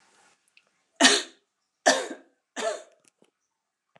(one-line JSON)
{"three_cough_length": "4.0 s", "three_cough_amplitude": 24954, "three_cough_signal_mean_std_ratio": 0.28, "survey_phase": "beta (2021-08-13 to 2022-03-07)", "age": "45-64", "gender": "Female", "wearing_mask": "No", "symptom_cough_any": true, "symptom_runny_or_blocked_nose": true, "symptom_shortness_of_breath": true, "symptom_diarrhoea": true, "symptom_fatigue": true, "symptom_fever_high_temperature": true, "symptom_headache": true, "smoker_status": "Ex-smoker", "respiratory_condition_asthma": false, "respiratory_condition_other": false, "recruitment_source": "Test and Trace", "submission_delay": "3 days", "covid_test_result": "Positive", "covid_test_method": "LFT"}